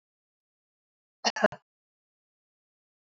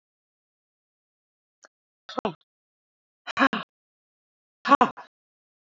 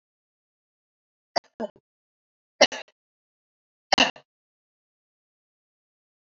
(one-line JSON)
{"cough_length": "3.1 s", "cough_amplitude": 12382, "cough_signal_mean_std_ratio": 0.15, "exhalation_length": "5.7 s", "exhalation_amplitude": 23326, "exhalation_signal_mean_std_ratio": 0.19, "three_cough_length": "6.2 s", "three_cough_amplitude": 24408, "three_cough_signal_mean_std_ratio": 0.14, "survey_phase": "alpha (2021-03-01 to 2021-08-12)", "age": "65+", "gender": "Female", "wearing_mask": "No", "symptom_none": true, "smoker_status": "Ex-smoker", "respiratory_condition_asthma": false, "respiratory_condition_other": true, "recruitment_source": "REACT", "submission_delay": "2 days", "covid_test_result": "Negative", "covid_test_method": "RT-qPCR"}